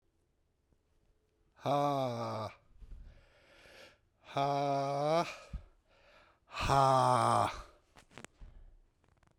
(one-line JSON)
{"exhalation_length": "9.4 s", "exhalation_amplitude": 5654, "exhalation_signal_mean_std_ratio": 0.46, "survey_phase": "beta (2021-08-13 to 2022-03-07)", "age": "45-64", "gender": "Male", "wearing_mask": "No", "symptom_cough_any": true, "symptom_runny_or_blocked_nose": true, "symptom_fatigue": true, "symptom_fever_high_temperature": true, "symptom_change_to_sense_of_smell_or_taste": true, "symptom_loss_of_taste": true, "symptom_onset": "3 days", "smoker_status": "Ex-smoker", "respiratory_condition_asthma": false, "respiratory_condition_other": false, "recruitment_source": "Test and Trace", "submission_delay": "2 days", "covid_test_result": "Positive", "covid_test_method": "RT-qPCR", "covid_ct_value": 16.2, "covid_ct_gene": "ORF1ab gene", "covid_ct_mean": 16.6, "covid_viral_load": "3500000 copies/ml", "covid_viral_load_category": "High viral load (>1M copies/ml)"}